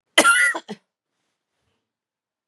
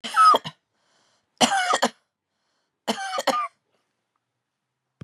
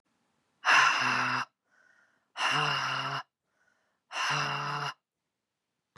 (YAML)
cough_length: 2.5 s
cough_amplitude: 32060
cough_signal_mean_std_ratio: 0.32
three_cough_length: 5.0 s
three_cough_amplitude: 24312
three_cough_signal_mean_std_ratio: 0.36
exhalation_length: 6.0 s
exhalation_amplitude: 10349
exhalation_signal_mean_std_ratio: 0.51
survey_phase: beta (2021-08-13 to 2022-03-07)
age: 45-64
gender: Female
wearing_mask: 'No'
symptom_cough_any: true
symptom_other: true
symptom_onset: 1 day
smoker_status: Never smoked
respiratory_condition_asthma: false
respiratory_condition_other: false
recruitment_source: Test and Trace
submission_delay: 1 day
covid_test_result: Positive
covid_test_method: RT-qPCR
covid_ct_value: 27.4
covid_ct_gene: ORF1ab gene